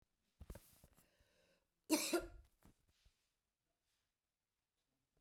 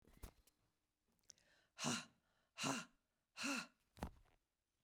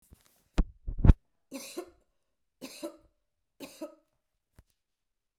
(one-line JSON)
{"cough_length": "5.2 s", "cough_amplitude": 2172, "cough_signal_mean_std_ratio": 0.22, "exhalation_length": "4.8 s", "exhalation_amplitude": 1414, "exhalation_signal_mean_std_ratio": 0.36, "three_cough_length": "5.4 s", "three_cough_amplitude": 27562, "three_cough_signal_mean_std_ratio": 0.17, "survey_phase": "beta (2021-08-13 to 2022-03-07)", "age": "45-64", "gender": "Female", "wearing_mask": "No", "symptom_cough_any": true, "symptom_runny_or_blocked_nose": true, "symptom_sore_throat": true, "symptom_abdominal_pain": true, "symptom_fatigue": true, "symptom_fever_high_temperature": true, "symptom_headache": true, "symptom_change_to_sense_of_smell_or_taste": true, "symptom_other": true, "smoker_status": "Never smoked", "respiratory_condition_asthma": false, "respiratory_condition_other": false, "recruitment_source": "Test and Trace", "submission_delay": "1 day", "covid_test_result": "Positive", "covid_test_method": "LFT"}